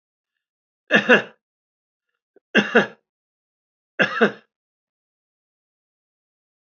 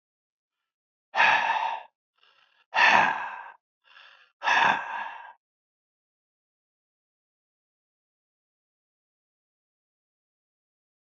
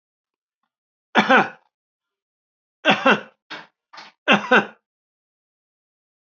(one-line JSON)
{"three_cough_length": "6.7 s", "three_cough_amplitude": 29591, "three_cough_signal_mean_std_ratio": 0.24, "exhalation_length": "11.1 s", "exhalation_amplitude": 19506, "exhalation_signal_mean_std_ratio": 0.3, "cough_length": "6.4 s", "cough_amplitude": 28504, "cough_signal_mean_std_ratio": 0.27, "survey_phase": "alpha (2021-03-01 to 2021-08-12)", "age": "65+", "gender": "Male", "wearing_mask": "No", "symptom_none": true, "smoker_status": "Ex-smoker", "respiratory_condition_asthma": false, "respiratory_condition_other": false, "recruitment_source": "REACT", "submission_delay": "8 days", "covid_test_result": "Negative", "covid_test_method": "RT-qPCR"}